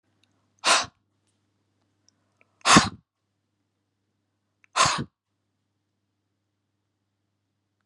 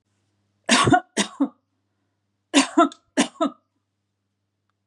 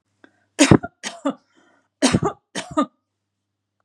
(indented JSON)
{
  "exhalation_length": "7.9 s",
  "exhalation_amplitude": 31568,
  "exhalation_signal_mean_std_ratio": 0.21,
  "three_cough_length": "4.9 s",
  "three_cough_amplitude": 27443,
  "three_cough_signal_mean_std_ratio": 0.34,
  "cough_length": "3.8 s",
  "cough_amplitude": 32768,
  "cough_signal_mean_std_ratio": 0.29,
  "survey_phase": "beta (2021-08-13 to 2022-03-07)",
  "age": "45-64",
  "gender": "Female",
  "wearing_mask": "No",
  "symptom_none": true,
  "smoker_status": "Ex-smoker",
  "respiratory_condition_asthma": false,
  "respiratory_condition_other": false,
  "recruitment_source": "REACT",
  "submission_delay": "1 day",
  "covid_test_result": "Negative",
  "covid_test_method": "RT-qPCR",
  "influenza_a_test_result": "Negative",
  "influenza_b_test_result": "Negative"
}